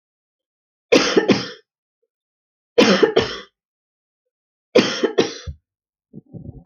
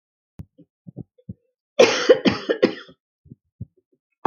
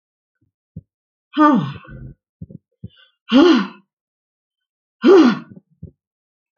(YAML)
three_cough_length: 6.7 s
three_cough_amplitude: 31090
three_cough_signal_mean_std_ratio: 0.35
cough_length: 4.3 s
cough_amplitude: 28240
cough_signal_mean_std_ratio: 0.29
exhalation_length: 6.6 s
exhalation_amplitude: 27823
exhalation_signal_mean_std_ratio: 0.34
survey_phase: alpha (2021-03-01 to 2021-08-12)
age: 65+
gender: Female
wearing_mask: 'No'
symptom_none: true
smoker_status: Never smoked
respiratory_condition_asthma: false
respiratory_condition_other: false
recruitment_source: REACT
submission_delay: 2 days
covid_test_result: Negative
covid_test_method: RT-qPCR